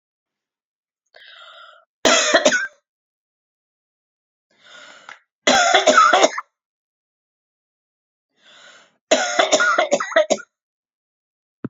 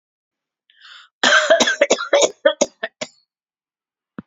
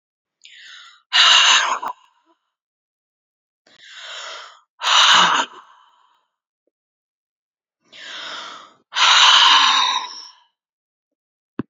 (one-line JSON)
{"three_cough_length": "11.7 s", "three_cough_amplitude": 32767, "three_cough_signal_mean_std_ratio": 0.36, "cough_length": "4.3 s", "cough_amplitude": 30523, "cough_signal_mean_std_ratio": 0.39, "exhalation_length": "11.7 s", "exhalation_amplitude": 30804, "exhalation_signal_mean_std_ratio": 0.4, "survey_phase": "alpha (2021-03-01 to 2021-08-12)", "age": "65+", "gender": "Female", "wearing_mask": "No", "symptom_none": true, "smoker_status": "Never smoked", "respiratory_condition_asthma": true, "respiratory_condition_other": false, "recruitment_source": "REACT", "submission_delay": "1 day", "covid_test_result": "Negative", "covid_test_method": "RT-qPCR"}